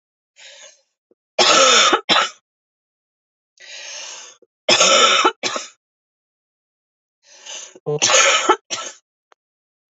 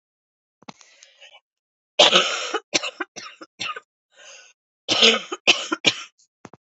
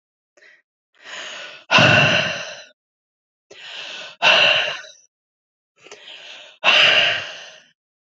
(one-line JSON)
{"three_cough_length": "9.9 s", "three_cough_amplitude": 32174, "three_cough_signal_mean_std_ratio": 0.41, "cough_length": "6.7 s", "cough_amplitude": 32167, "cough_signal_mean_std_ratio": 0.33, "exhalation_length": "8.0 s", "exhalation_amplitude": 29851, "exhalation_signal_mean_std_ratio": 0.43, "survey_phase": "alpha (2021-03-01 to 2021-08-12)", "age": "18-44", "gender": "Female", "wearing_mask": "No", "symptom_cough_any": true, "symptom_headache": true, "smoker_status": "Never smoked", "respiratory_condition_asthma": true, "respiratory_condition_other": false, "recruitment_source": "Test and Trace", "submission_delay": "2 days", "covid_test_result": "Positive", "covid_test_method": "RT-qPCR", "covid_ct_value": 21.7, "covid_ct_gene": "ORF1ab gene", "covid_ct_mean": 22.8, "covid_viral_load": "34000 copies/ml", "covid_viral_load_category": "Low viral load (10K-1M copies/ml)"}